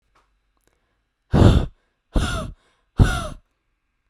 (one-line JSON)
{"exhalation_length": "4.1 s", "exhalation_amplitude": 31202, "exhalation_signal_mean_std_ratio": 0.33, "survey_phase": "beta (2021-08-13 to 2022-03-07)", "age": "18-44", "gender": "Female", "wearing_mask": "No", "symptom_none": true, "symptom_onset": "13 days", "smoker_status": "Never smoked", "respiratory_condition_asthma": false, "respiratory_condition_other": false, "recruitment_source": "REACT", "submission_delay": "0 days", "covid_test_result": "Negative", "covid_test_method": "RT-qPCR"}